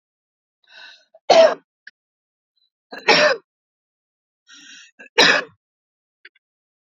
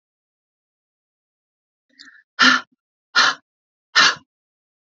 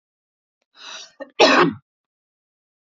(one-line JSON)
{"three_cough_length": "6.8 s", "three_cough_amplitude": 32768, "three_cough_signal_mean_std_ratio": 0.27, "exhalation_length": "4.9 s", "exhalation_amplitude": 28024, "exhalation_signal_mean_std_ratio": 0.27, "cough_length": "3.0 s", "cough_amplitude": 29565, "cough_signal_mean_std_ratio": 0.28, "survey_phase": "beta (2021-08-13 to 2022-03-07)", "age": "18-44", "gender": "Female", "wearing_mask": "No", "symptom_none": true, "smoker_status": "Never smoked", "respiratory_condition_asthma": false, "respiratory_condition_other": false, "recruitment_source": "REACT", "submission_delay": "2 days", "covid_test_result": "Negative", "covid_test_method": "RT-qPCR", "influenza_a_test_result": "Negative", "influenza_b_test_result": "Negative"}